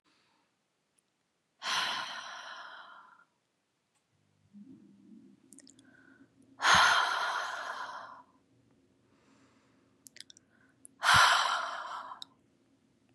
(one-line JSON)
{"exhalation_length": "13.1 s", "exhalation_amplitude": 11318, "exhalation_signal_mean_std_ratio": 0.34, "survey_phase": "beta (2021-08-13 to 2022-03-07)", "age": "18-44", "gender": "Female", "wearing_mask": "No", "symptom_cough_any": true, "symptom_runny_or_blocked_nose": true, "smoker_status": "Never smoked", "respiratory_condition_asthma": false, "respiratory_condition_other": false, "recruitment_source": "Test and Trace", "submission_delay": "2 days", "covid_test_result": "Positive", "covid_test_method": "LFT"}